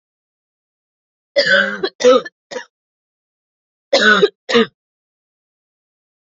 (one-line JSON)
{"three_cough_length": "6.3 s", "three_cough_amplitude": 31244, "three_cough_signal_mean_std_ratio": 0.34, "survey_phase": "alpha (2021-03-01 to 2021-08-12)", "age": "18-44", "gender": "Female", "wearing_mask": "No", "symptom_cough_any": true, "symptom_new_continuous_cough": true, "symptom_fatigue": true, "symptom_change_to_sense_of_smell_or_taste": true, "symptom_onset": "3 days", "smoker_status": "Never smoked", "respiratory_condition_asthma": false, "respiratory_condition_other": false, "recruitment_source": "Test and Trace", "submission_delay": "1 day", "covid_test_result": "Positive", "covid_test_method": "RT-qPCR", "covid_ct_value": 21.6, "covid_ct_gene": "ORF1ab gene", "covid_ct_mean": 22.1, "covid_viral_load": "58000 copies/ml", "covid_viral_load_category": "Low viral load (10K-1M copies/ml)"}